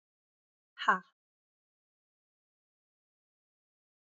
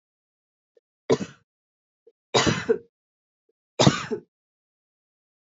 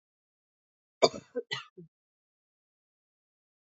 {"exhalation_length": "4.2 s", "exhalation_amplitude": 7518, "exhalation_signal_mean_std_ratio": 0.13, "three_cough_length": "5.5 s", "three_cough_amplitude": 23226, "three_cough_signal_mean_std_ratio": 0.26, "cough_length": "3.7 s", "cough_amplitude": 15780, "cough_signal_mean_std_ratio": 0.15, "survey_phase": "beta (2021-08-13 to 2022-03-07)", "age": "18-44", "gender": "Female", "wearing_mask": "No", "symptom_runny_or_blocked_nose": true, "symptom_sore_throat": true, "symptom_diarrhoea": true, "symptom_fatigue": true, "symptom_headache": true, "symptom_onset": "3 days", "smoker_status": "Never smoked", "respiratory_condition_asthma": false, "respiratory_condition_other": false, "recruitment_source": "Test and Trace", "submission_delay": "2 days", "covid_test_result": "Positive", "covid_test_method": "RT-qPCR", "covid_ct_value": 21.7, "covid_ct_gene": "ORF1ab gene", "covid_ct_mean": 22.1, "covid_viral_load": "55000 copies/ml", "covid_viral_load_category": "Low viral load (10K-1M copies/ml)"}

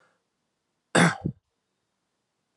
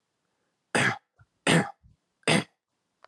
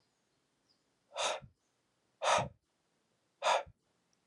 {"cough_length": "2.6 s", "cough_amplitude": 20264, "cough_signal_mean_std_ratio": 0.24, "three_cough_length": "3.1 s", "three_cough_amplitude": 12874, "three_cough_signal_mean_std_ratio": 0.34, "exhalation_length": "4.3 s", "exhalation_amplitude": 4739, "exhalation_signal_mean_std_ratio": 0.31, "survey_phase": "alpha (2021-03-01 to 2021-08-12)", "age": "18-44", "gender": "Male", "wearing_mask": "No", "symptom_none": true, "smoker_status": "Never smoked", "respiratory_condition_asthma": false, "respiratory_condition_other": false, "recruitment_source": "Test and Trace", "submission_delay": "0 days", "covid_test_result": "Negative", "covid_test_method": "LFT"}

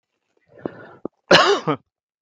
{"cough_length": "2.2 s", "cough_amplitude": 32768, "cough_signal_mean_std_ratio": 0.33, "survey_phase": "beta (2021-08-13 to 2022-03-07)", "age": "45-64", "gender": "Male", "wearing_mask": "Yes", "symptom_none": true, "smoker_status": "Never smoked", "respiratory_condition_asthma": false, "respiratory_condition_other": false, "recruitment_source": "REACT", "submission_delay": "3 days", "covid_test_result": "Negative", "covid_test_method": "RT-qPCR", "influenza_a_test_result": "Negative", "influenza_b_test_result": "Negative"}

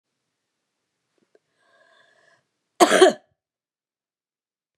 {"cough_length": "4.8 s", "cough_amplitude": 30440, "cough_signal_mean_std_ratio": 0.19, "survey_phase": "beta (2021-08-13 to 2022-03-07)", "age": "65+", "gender": "Female", "wearing_mask": "No", "symptom_cough_any": true, "symptom_sore_throat": true, "symptom_fatigue": true, "symptom_headache": true, "symptom_onset": "8 days", "smoker_status": "Never smoked", "respiratory_condition_asthma": false, "respiratory_condition_other": false, "recruitment_source": "Test and Trace", "submission_delay": "3 days", "covid_test_result": "Negative", "covid_test_method": "ePCR"}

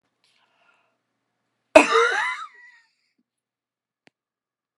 {"cough_length": "4.8 s", "cough_amplitude": 32768, "cough_signal_mean_std_ratio": 0.23, "survey_phase": "alpha (2021-03-01 to 2021-08-12)", "age": "65+", "gender": "Female", "wearing_mask": "No", "symptom_none": true, "smoker_status": "Never smoked", "respiratory_condition_asthma": false, "respiratory_condition_other": false, "recruitment_source": "REACT", "submission_delay": "1 day", "covid_test_result": "Negative", "covid_test_method": "RT-qPCR"}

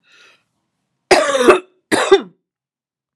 {"cough_length": "3.2 s", "cough_amplitude": 32768, "cough_signal_mean_std_ratio": 0.37, "survey_phase": "alpha (2021-03-01 to 2021-08-12)", "age": "45-64", "gender": "Female", "wearing_mask": "No", "symptom_cough_any": true, "symptom_fatigue": true, "symptom_headache": true, "symptom_onset": "5 days", "smoker_status": "Ex-smoker", "respiratory_condition_asthma": false, "respiratory_condition_other": false, "recruitment_source": "Test and Trace", "submission_delay": "1 day", "covid_test_result": "Positive", "covid_test_method": "RT-qPCR", "covid_ct_value": 12.0, "covid_ct_gene": "ORF1ab gene", "covid_ct_mean": 12.3, "covid_viral_load": "92000000 copies/ml", "covid_viral_load_category": "High viral load (>1M copies/ml)"}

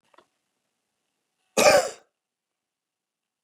{"cough_length": "3.4 s", "cough_amplitude": 22332, "cough_signal_mean_std_ratio": 0.22, "survey_phase": "beta (2021-08-13 to 2022-03-07)", "age": "45-64", "gender": "Male", "wearing_mask": "No", "symptom_change_to_sense_of_smell_or_taste": true, "smoker_status": "Ex-smoker", "respiratory_condition_asthma": false, "respiratory_condition_other": false, "recruitment_source": "REACT", "submission_delay": "2 days", "covid_test_result": "Negative", "covid_test_method": "RT-qPCR"}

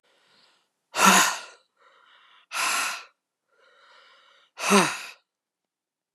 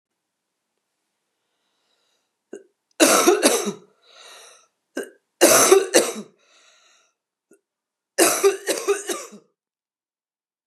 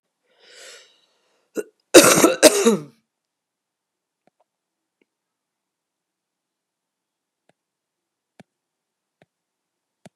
{"exhalation_length": "6.1 s", "exhalation_amplitude": 27485, "exhalation_signal_mean_std_ratio": 0.33, "three_cough_length": "10.7 s", "three_cough_amplitude": 32767, "three_cough_signal_mean_std_ratio": 0.34, "cough_length": "10.2 s", "cough_amplitude": 32768, "cough_signal_mean_std_ratio": 0.2, "survey_phase": "beta (2021-08-13 to 2022-03-07)", "age": "45-64", "gender": "Female", "wearing_mask": "No", "symptom_cough_any": true, "symptom_fatigue": true, "symptom_headache": true, "smoker_status": "Current smoker (e-cigarettes or vapes only)", "respiratory_condition_asthma": false, "respiratory_condition_other": false, "recruitment_source": "Test and Trace", "submission_delay": "2 days", "covid_test_result": "Positive", "covid_test_method": "RT-qPCR", "covid_ct_value": 24.7, "covid_ct_gene": "N gene"}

